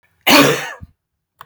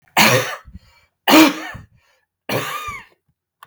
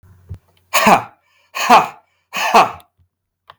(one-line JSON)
{"cough_length": "1.5 s", "cough_amplitude": 32767, "cough_signal_mean_std_ratio": 0.41, "three_cough_length": "3.7 s", "three_cough_amplitude": 32768, "three_cough_signal_mean_std_ratio": 0.39, "exhalation_length": "3.6 s", "exhalation_amplitude": 32766, "exhalation_signal_mean_std_ratio": 0.39, "survey_phase": "beta (2021-08-13 to 2022-03-07)", "age": "45-64", "gender": "Male", "wearing_mask": "No", "symptom_none": true, "smoker_status": "Never smoked", "respiratory_condition_asthma": false, "respiratory_condition_other": false, "recruitment_source": "REACT", "submission_delay": "2 days", "covid_test_result": "Negative", "covid_test_method": "RT-qPCR", "influenza_a_test_result": "Negative", "influenza_b_test_result": "Negative"}